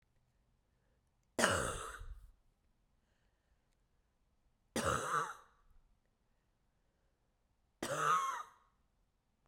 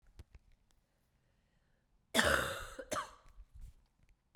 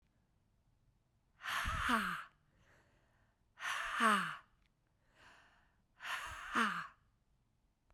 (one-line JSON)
{"three_cough_length": "9.5 s", "three_cough_amplitude": 6256, "three_cough_signal_mean_std_ratio": 0.34, "cough_length": "4.4 s", "cough_amplitude": 9033, "cough_signal_mean_std_ratio": 0.32, "exhalation_length": "7.9 s", "exhalation_amplitude": 4090, "exhalation_signal_mean_std_ratio": 0.41, "survey_phase": "beta (2021-08-13 to 2022-03-07)", "age": "18-44", "gender": "Female", "wearing_mask": "No", "symptom_cough_any": true, "symptom_sore_throat": true, "symptom_fatigue": true, "symptom_headache": true, "symptom_onset": "3 days", "smoker_status": "Never smoked", "respiratory_condition_asthma": true, "respiratory_condition_other": false, "recruitment_source": "Test and Trace", "submission_delay": "2 days", "covid_test_result": "Positive", "covid_test_method": "RT-qPCR"}